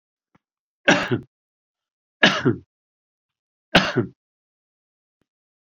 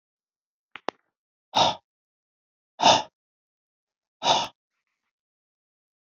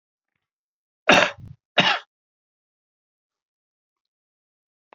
{"three_cough_length": "5.7 s", "three_cough_amplitude": 30887, "three_cough_signal_mean_std_ratio": 0.27, "exhalation_length": "6.1 s", "exhalation_amplitude": 22274, "exhalation_signal_mean_std_ratio": 0.24, "cough_length": "4.9 s", "cough_amplitude": 28141, "cough_signal_mean_std_ratio": 0.21, "survey_phase": "beta (2021-08-13 to 2022-03-07)", "age": "45-64", "gender": "Male", "wearing_mask": "No", "symptom_none": true, "smoker_status": "Never smoked", "respiratory_condition_asthma": false, "respiratory_condition_other": false, "recruitment_source": "REACT", "submission_delay": "1 day", "covid_test_result": "Negative", "covid_test_method": "RT-qPCR", "influenza_a_test_result": "Negative", "influenza_b_test_result": "Negative"}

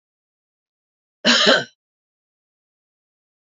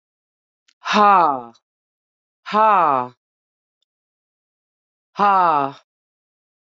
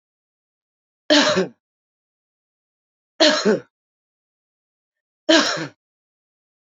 {"cough_length": "3.6 s", "cough_amplitude": 27248, "cough_signal_mean_std_ratio": 0.25, "exhalation_length": "6.7 s", "exhalation_amplitude": 26323, "exhalation_signal_mean_std_ratio": 0.36, "three_cough_length": "6.7 s", "three_cough_amplitude": 27646, "three_cough_signal_mean_std_ratio": 0.3, "survey_phase": "beta (2021-08-13 to 2022-03-07)", "age": "45-64", "gender": "Female", "wearing_mask": "No", "symptom_runny_or_blocked_nose": true, "smoker_status": "Current smoker (1 to 10 cigarettes per day)", "respiratory_condition_asthma": false, "respiratory_condition_other": false, "recruitment_source": "Test and Trace", "submission_delay": "2 days", "covid_test_result": "Positive", "covid_test_method": "LFT"}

